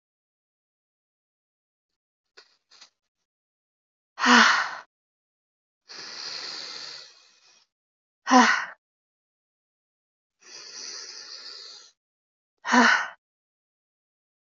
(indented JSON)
{
  "exhalation_length": "14.6 s",
  "exhalation_amplitude": 22325,
  "exhalation_signal_mean_std_ratio": 0.26,
  "survey_phase": "beta (2021-08-13 to 2022-03-07)",
  "age": "18-44",
  "gender": "Female",
  "wearing_mask": "No",
  "symptom_new_continuous_cough": true,
  "symptom_runny_or_blocked_nose": true,
  "symptom_sore_throat": true,
  "symptom_fatigue": true,
  "symptom_fever_high_temperature": true,
  "symptom_headache": true,
  "symptom_change_to_sense_of_smell_or_taste": true,
  "symptom_onset": "3 days",
  "smoker_status": "Never smoked",
  "respiratory_condition_asthma": false,
  "respiratory_condition_other": false,
  "recruitment_source": "Test and Trace",
  "submission_delay": "1 day",
  "covid_test_result": "Positive",
  "covid_test_method": "RT-qPCR",
  "covid_ct_value": 11.8,
  "covid_ct_gene": "ORF1ab gene",
  "covid_ct_mean": 12.3,
  "covid_viral_load": "95000000 copies/ml",
  "covid_viral_load_category": "High viral load (>1M copies/ml)"
}